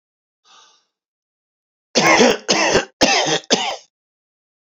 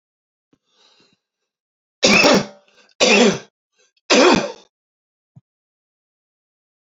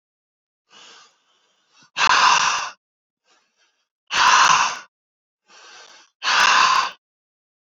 {
  "cough_length": "4.6 s",
  "cough_amplitude": 32767,
  "cough_signal_mean_std_ratio": 0.44,
  "three_cough_length": "6.9 s",
  "three_cough_amplitude": 30476,
  "three_cough_signal_mean_std_ratio": 0.33,
  "exhalation_length": "7.8 s",
  "exhalation_amplitude": 24048,
  "exhalation_signal_mean_std_ratio": 0.41,
  "survey_phase": "beta (2021-08-13 to 2022-03-07)",
  "age": "45-64",
  "gender": "Male",
  "wearing_mask": "No",
  "symptom_none": true,
  "smoker_status": "Ex-smoker",
  "respiratory_condition_asthma": false,
  "respiratory_condition_other": false,
  "recruitment_source": "REACT",
  "submission_delay": "2 days",
  "covid_test_result": "Negative",
  "covid_test_method": "RT-qPCR",
  "influenza_a_test_result": "Negative",
  "influenza_b_test_result": "Negative"
}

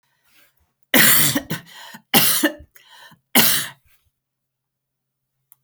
{
  "three_cough_length": "5.6 s",
  "three_cough_amplitude": 32768,
  "three_cough_signal_mean_std_ratio": 0.37,
  "survey_phase": "beta (2021-08-13 to 2022-03-07)",
  "age": "45-64",
  "gender": "Female",
  "wearing_mask": "No",
  "symptom_runny_or_blocked_nose": true,
  "symptom_fatigue": true,
  "symptom_onset": "12 days",
  "smoker_status": "Never smoked",
  "respiratory_condition_asthma": false,
  "respiratory_condition_other": false,
  "recruitment_source": "REACT",
  "submission_delay": "8 days",
  "covid_test_result": "Negative",
  "covid_test_method": "RT-qPCR",
  "influenza_a_test_result": "Negative",
  "influenza_b_test_result": "Negative"
}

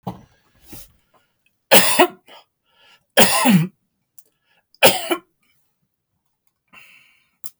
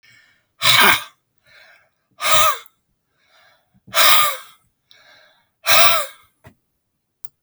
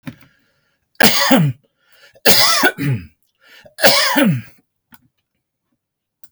{
  "three_cough_length": "7.6 s",
  "three_cough_amplitude": 32768,
  "three_cough_signal_mean_std_ratio": 0.3,
  "exhalation_length": "7.4 s",
  "exhalation_amplitude": 32768,
  "exhalation_signal_mean_std_ratio": 0.37,
  "cough_length": "6.3 s",
  "cough_amplitude": 32768,
  "cough_signal_mean_std_ratio": 0.44,
  "survey_phase": "beta (2021-08-13 to 2022-03-07)",
  "age": "65+",
  "gender": "Male",
  "wearing_mask": "No",
  "symptom_none": true,
  "smoker_status": "Ex-smoker",
  "respiratory_condition_asthma": true,
  "respiratory_condition_other": false,
  "recruitment_source": "REACT",
  "submission_delay": "4 days",
  "covid_test_result": "Negative",
  "covid_test_method": "RT-qPCR"
}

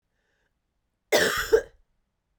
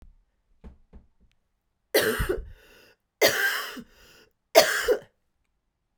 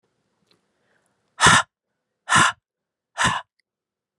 {
  "cough_length": "2.4 s",
  "cough_amplitude": 14651,
  "cough_signal_mean_std_ratio": 0.32,
  "three_cough_length": "6.0 s",
  "three_cough_amplitude": 32767,
  "three_cough_signal_mean_std_ratio": 0.35,
  "exhalation_length": "4.2 s",
  "exhalation_amplitude": 31854,
  "exhalation_signal_mean_std_ratio": 0.3,
  "survey_phase": "alpha (2021-03-01 to 2021-08-12)",
  "age": "45-64",
  "gender": "Female",
  "wearing_mask": "No",
  "symptom_fatigue": true,
  "symptom_headache": true,
  "symptom_onset": "3 days",
  "smoker_status": "Never smoked",
  "respiratory_condition_asthma": false,
  "respiratory_condition_other": false,
  "recruitment_source": "Test and Trace",
  "submission_delay": "1 day",
  "covid_test_result": "Positive",
  "covid_test_method": "RT-qPCR",
  "covid_ct_value": 19.2,
  "covid_ct_gene": "ORF1ab gene",
  "covid_ct_mean": 19.5,
  "covid_viral_load": "400000 copies/ml",
  "covid_viral_load_category": "Low viral load (10K-1M copies/ml)"
}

